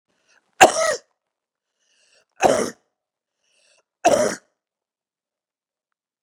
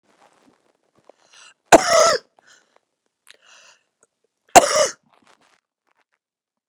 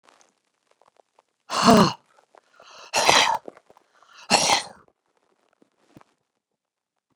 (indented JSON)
{
  "three_cough_length": "6.2 s",
  "three_cough_amplitude": 32768,
  "three_cough_signal_mean_std_ratio": 0.25,
  "cough_length": "6.7 s",
  "cough_amplitude": 32768,
  "cough_signal_mean_std_ratio": 0.22,
  "exhalation_length": "7.2 s",
  "exhalation_amplitude": 32750,
  "exhalation_signal_mean_std_ratio": 0.3,
  "survey_phase": "beta (2021-08-13 to 2022-03-07)",
  "age": "65+",
  "gender": "Female",
  "wearing_mask": "No",
  "symptom_other": true,
  "smoker_status": "Never smoked",
  "respiratory_condition_asthma": false,
  "respiratory_condition_other": false,
  "recruitment_source": "REACT",
  "submission_delay": "2 days",
  "covid_test_result": "Negative",
  "covid_test_method": "RT-qPCR",
  "influenza_a_test_result": "Unknown/Void",
  "influenza_b_test_result": "Unknown/Void"
}